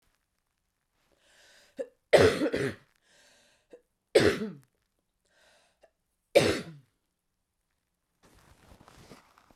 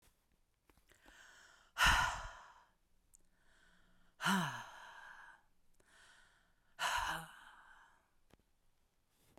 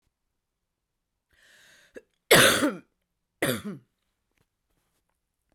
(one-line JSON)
{"three_cough_length": "9.6 s", "three_cough_amplitude": 16719, "three_cough_signal_mean_std_ratio": 0.25, "exhalation_length": "9.4 s", "exhalation_amplitude": 4708, "exhalation_signal_mean_std_ratio": 0.32, "cough_length": "5.5 s", "cough_amplitude": 22712, "cough_signal_mean_std_ratio": 0.25, "survey_phase": "beta (2021-08-13 to 2022-03-07)", "age": "18-44", "gender": "Male", "wearing_mask": "No", "symptom_cough_any": true, "symptom_runny_or_blocked_nose": true, "symptom_onset": "7 days", "smoker_status": "Never smoked", "respiratory_condition_asthma": false, "respiratory_condition_other": false, "recruitment_source": "Test and Trace", "submission_delay": "3 days", "covid_test_result": "Positive", "covid_test_method": "RT-qPCR", "covid_ct_value": 16.4, "covid_ct_gene": "ORF1ab gene", "covid_ct_mean": 16.9, "covid_viral_load": "2900000 copies/ml", "covid_viral_load_category": "High viral load (>1M copies/ml)"}